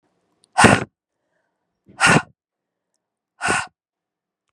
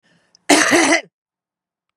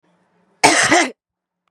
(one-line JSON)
{"exhalation_length": "4.5 s", "exhalation_amplitude": 32768, "exhalation_signal_mean_std_ratio": 0.28, "cough_length": "2.0 s", "cough_amplitude": 32767, "cough_signal_mean_std_ratio": 0.42, "three_cough_length": "1.7 s", "three_cough_amplitude": 32768, "three_cough_signal_mean_std_ratio": 0.42, "survey_phase": "beta (2021-08-13 to 2022-03-07)", "age": "18-44", "gender": "Female", "wearing_mask": "No", "symptom_cough_any": true, "symptom_runny_or_blocked_nose": true, "symptom_fatigue": true, "symptom_headache": true, "symptom_onset": "4 days", "smoker_status": "Current smoker (e-cigarettes or vapes only)", "respiratory_condition_asthma": false, "respiratory_condition_other": false, "recruitment_source": "Test and Trace", "submission_delay": "1 day", "covid_test_result": "Positive", "covid_test_method": "RT-qPCR", "covid_ct_value": 21.3, "covid_ct_gene": "ORF1ab gene"}